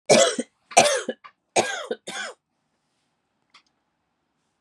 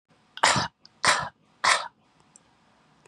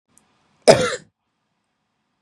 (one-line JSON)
{"three_cough_length": "4.6 s", "three_cough_amplitude": 30677, "three_cough_signal_mean_std_ratio": 0.32, "exhalation_length": "3.1 s", "exhalation_amplitude": 27513, "exhalation_signal_mean_std_ratio": 0.36, "cough_length": "2.2 s", "cough_amplitude": 32768, "cough_signal_mean_std_ratio": 0.23, "survey_phase": "beta (2021-08-13 to 2022-03-07)", "age": "18-44", "gender": "Female", "wearing_mask": "No", "symptom_cough_any": true, "symptom_runny_or_blocked_nose": true, "symptom_sore_throat": true, "symptom_headache": true, "smoker_status": "Ex-smoker", "respiratory_condition_asthma": false, "respiratory_condition_other": false, "recruitment_source": "Test and Trace", "submission_delay": "1 day", "covid_test_result": "Positive", "covid_test_method": "LFT"}